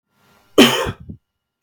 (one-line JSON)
{"cough_length": "1.6 s", "cough_amplitude": 32768, "cough_signal_mean_std_ratio": 0.32, "survey_phase": "beta (2021-08-13 to 2022-03-07)", "age": "45-64", "gender": "Male", "wearing_mask": "No", "symptom_cough_any": true, "symptom_sore_throat": true, "symptom_onset": "6 days", "smoker_status": "Never smoked", "respiratory_condition_asthma": true, "respiratory_condition_other": false, "recruitment_source": "REACT", "submission_delay": "2 days", "covid_test_result": "Negative", "covid_test_method": "RT-qPCR", "influenza_a_test_result": "Negative", "influenza_b_test_result": "Negative"}